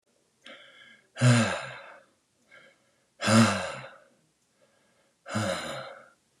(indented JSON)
{
  "exhalation_length": "6.4 s",
  "exhalation_amplitude": 12720,
  "exhalation_signal_mean_std_ratio": 0.36,
  "survey_phase": "beta (2021-08-13 to 2022-03-07)",
  "age": "18-44",
  "gender": "Male",
  "wearing_mask": "No",
  "symptom_none": true,
  "smoker_status": "Never smoked",
  "respiratory_condition_asthma": false,
  "respiratory_condition_other": false,
  "recruitment_source": "REACT",
  "submission_delay": "4 days",
  "covid_test_method": "RT-qPCR",
  "influenza_a_test_result": "Unknown/Void",
  "influenza_b_test_result": "Unknown/Void"
}